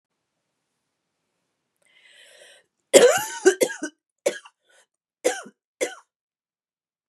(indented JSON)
{
  "three_cough_length": "7.1 s",
  "three_cough_amplitude": 32767,
  "three_cough_signal_mean_std_ratio": 0.24,
  "survey_phase": "beta (2021-08-13 to 2022-03-07)",
  "age": "45-64",
  "gender": "Female",
  "wearing_mask": "No",
  "symptom_cough_any": true,
  "symptom_runny_or_blocked_nose": true,
  "symptom_shortness_of_breath": true,
  "symptom_fatigue": true,
  "symptom_fever_high_temperature": true,
  "symptom_headache": true,
  "symptom_change_to_sense_of_smell_or_taste": true,
  "symptom_loss_of_taste": true,
  "symptom_onset": "5 days",
  "smoker_status": "Never smoked",
  "respiratory_condition_asthma": false,
  "respiratory_condition_other": false,
  "recruitment_source": "Test and Trace",
  "submission_delay": "1 day",
  "covid_test_result": "Positive",
  "covid_test_method": "ePCR"
}